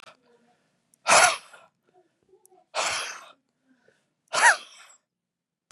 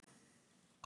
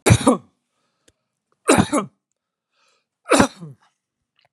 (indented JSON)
{
  "exhalation_length": "5.7 s",
  "exhalation_amplitude": 20594,
  "exhalation_signal_mean_std_ratio": 0.28,
  "cough_length": "0.9 s",
  "cough_amplitude": 508,
  "cough_signal_mean_std_ratio": 0.51,
  "three_cough_length": "4.5 s",
  "three_cough_amplitude": 32756,
  "three_cough_signal_mean_std_ratio": 0.31,
  "survey_phase": "beta (2021-08-13 to 2022-03-07)",
  "age": "45-64",
  "gender": "Male",
  "wearing_mask": "No",
  "symptom_none": true,
  "smoker_status": "Never smoked",
  "respiratory_condition_asthma": false,
  "respiratory_condition_other": false,
  "recruitment_source": "REACT",
  "submission_delay": "3 days",
  "covid_test_result": "Negative",
  "covid_test_method": "RT-qPCR",
  "influenza_a_test_result": "Negative",
  "influenza_b_test_result": "Negative"
}